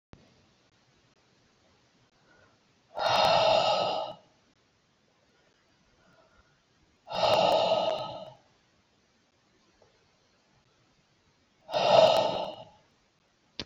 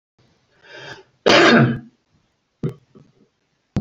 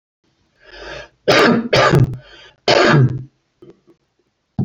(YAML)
exhalation_length: 13.7 s
exhalation_amplitude: 16941
exhalation_signal_mean_std_ratio: 0.38
cough_length: 3.8 s
cough_amplitude: 29562
cough_signal_mean_std_ratio: 0.33
three_cough_length: 4.6 s
three_cough_amplitude: 32768
three_cough_signal_mean_std_ratio: 0.47
survey_phase: beta (2021-08-13 to 2022-03-07)
age: 45-64
gender: Male
wearing_mask: 'No'
symptom_none: true
smoker_status: Ex-smoker
respiratory_condition_asthma: false
respiratory_condition_other: false
recruitment_source: REACT
submission_delay: 0 days
covid_test_result: Negative
covid_test_method: RT-qPCR